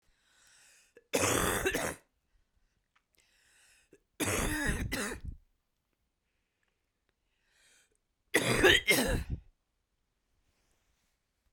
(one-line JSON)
{"three_cough_length": "11.5 s", "three_cough_amplitude": 9716, "three_cough_signal_mean_std_ratio": 0.37, "survey_phase": "beta (2021-08-13 to 2022-03-07)", "age": "45-64", "gender": "Female", "wearing_mask": "No", "symptom_cough_any": true, "symptom_sore_throat": true, "symptom_abdominal_pain": true, "symptom_fatigue": true, "smoker_status": "Never smoked", "respiratory_condition_asthma": false, "respiratory_condition_other": false, "recruitment_source": "Test and Trace", "submission_delay": "1 day", "covid_test_result": "Positive", "covid_test_method": "LFT"}